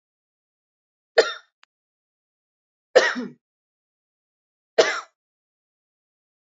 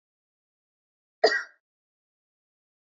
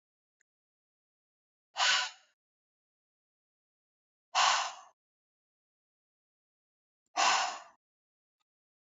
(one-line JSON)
{"three_cough_length": "6.5 s", "three_cough_amplitude": 25896, "three_cough_signal_mean_std_ratio": 0.2, "cough_length": "2.8 s", "cough_amplitude": 13693, "cough_signal_mean_std_ratio": 0.18, "exhalation_length": "9.0 s", "exhalation_amplitude": 7803, "exhalation_signal_mean_std_ratio": 0.27, "survey_phase": "beta (2021-08-13 to 2022-03-07)", "age": "18-44", "gender": "Female", "wearing_mask": "No", "symptom_none": true, "smoker_status": "Never smoked", "respiratory_condition_asthma": false, "respiratory_condition_other": false, "recruitment_source": "REACT", "submission_delay": "1 day", "covid_test_result": "Negative", "covid_test_method": "RT-qPCR"}